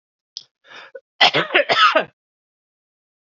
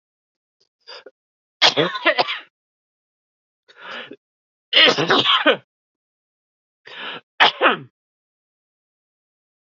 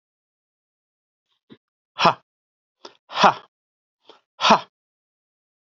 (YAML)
cough_length: 3.3 s
cough_amplitude: 29214
cough_signal_mean_std_ratio: 0.35
three_cough_length: 9.6 s
three_cough_amplitude: 32767
three_cough_signal_mean_std_ratio: 0.32
exhalation_length: 5.6 s
exhalation_amplitude: 28349
exhalation_signal_mean_std_ratio: 0.21
survey_phase: beta (2021-08-13 to 2022-03-07)
age: 45-64
gender: Male
wearing_mask: 'No'
symptom_cough_any: true
symptom_runny_or_blocked_nose: true
symptom_sore_throat: true
symptom_fatigue: true
symptom_fever_high_temperature: true
symptom_headache: true
smoker_status: Never smoked
respiratory_condition_asthma: false
respiratory_condition_other: false
recruitment_source: Test and Trace
submission_delay: 0 days
covid_test_result: Positive
covid_test_method: LFT